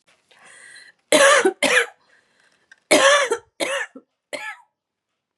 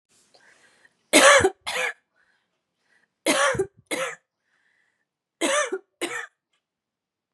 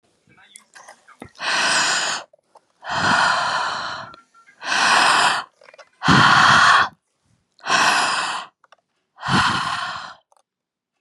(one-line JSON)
{"cough_length": "5.4 s", "cough_amplitude": 29122, "cough_signal_mean_std_ratio": 0.4, "three_cough_length": "7.3 s", "three_cough_amplitude": 28297, "three_cough_signal_mean_std_ratio": 0.33, "exhalation_length": "11.0 s", "exhalation_amplitude": 30127, "exhalation_signal_mean_std_ratio": 0.56, "survey_phase": "beta (2021-08-13 to 2022-03-07)", "age": "18-44", "gender": "Female", "wearing_mask": "Yes", "symptom_cough_any": true, "symptom_runny_or_blocked_nose": true, "symptom_shortness_of_breath": true, "symptom_fever_high_temperature": true, "symptom_headache": true, "symptom_change_to_sense_of_smell_or_taste": true, "symptom_loss_of_taste": true, "smoker_status": "Never smoked", "respiratory_condition_asthma": false, "respiratory_condition_other": false, "recruitment_source": "Test and Trace", "submission_delay": "16 days", "covid_test_result": "Negative", "covid_test_method": "RT-qPCR"}